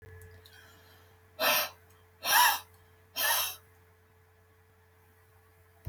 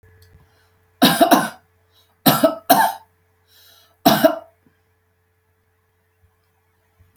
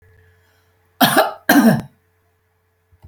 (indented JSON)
{
  "exhalation_length": "5.9 s",
  "exhalation_amplitude": 9301,
  "exhalation_signal_mean_std_ratio": 0.36,
  "three_cough_length": "7.2 s",
  "three_cough_amplitude": 32768,
  "three_cough_signal_mean_std_ratio": 0.32,
  "cough_length": "3.1 s",
  "cough_amplitude": 32768,
  "cough_signal_mean_std_ratio": 0.37,
  "survey_phase": "alpha (2021-03-01 to 2021-08-12)",
  "age": "45-64",
  "gender": "Female",
  "wearing_mask": "No",
  "symptom_none": true,
  "smoker_status": "Never smoked",
  "respiratory_condition_asthma": false,
  "respiratory_condition_other": false,
  "recruitment_source": "REACT",
  "submission_delay": "7 days",
  "covid_test_result": "Negative",
  "covid_test_method": "RT-qPCR"
}